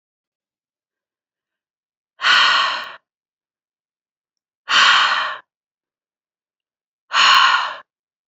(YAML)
exhalation_length: 8.3 s
exhalation_amplitude: 29240
exhalation_signal_mean_std_ratio: 0.38
survey_phase: beta (2021-08-13 to 2022-03-07)
age: 18-44
gender: Female
wearing_mask: 'No'
symptom_none: true
smoker_status: Never smoked
respiratory_condition_asthma: false
respiratory_condition_other: false
recruitment_source: REACT
submission_delay: 4 days
covid_test_result: Negative
covid_test_method: RT-qPCR
influenza_a_test_result: Negative
influenza_b_test_result: Negative